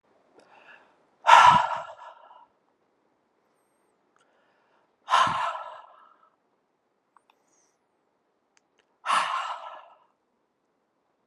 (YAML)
exhalation_length: 11.3 s
exhalation_amplitude: 31727
exhalation_signal_mean_std_ratio: 0.25
survey_phase: alpha (2021-03-01 to 2021-08-12)
age: 45-64
gender: Female
wearing_mask: 'No'
symptom_cough_any: true
symptom_fatigue: true
symptom_headache: true
symptom_onset: 3 days
smoker_status: Never smoked
respiratory_condition_asthma: false
respiratory_condition_other: false
recruitment_source: Test and Trace
submission_delay: 1 day
covid_test_result: Positive
covid_test_method: RT-qPCR
covid_ct_value: 13.8
covid_ct_gene: ORF1ab gene
covid_ct_mean: 14.6
covid_viral_load: 17000000 copies/ml
covid_viral_load_category: High viral load (>1M copies/ml)